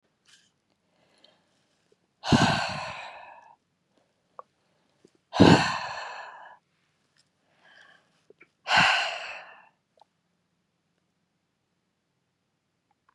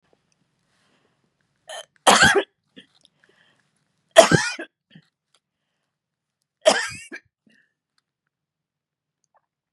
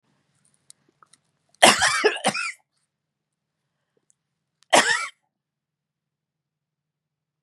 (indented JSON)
{
  "exhalation_length": "13.1 s",
  "exhalation_amplitude": 23596,
  "exhalation_signal_mean_std_ratio": 0.26,
  "three_cough_length": "9.7 s",
  "three_cough_amplitude": 32768,
  "three_cough_signal_mean_std_ratio": 0.22,
  "cough_length": "7.4 s",
  "cough_amplitude": 32768,
  "cough_signal_mean_std_ratio": 0.26,
  "survey_phase": "beta (2021-08-13 to 2022-03-07)",
  "age": "65+",
  "gender": "Female",
  "wearing_mask": "No",
  "symptom_none": true,
  "smoker_status": "Ex-smoker",
  "respiratory_condition_asthma": false,
  "respiratory_condition_other": false,
  "recruitment_source": "REACT",
  "submission_delay": "1 day",
  "covid_test_result": "Negative",
  "covid_test_method": "RT-qPCR",
  "influenza_a_test_result": "Negative",
  "influenza_b_test_result": "Negative"
}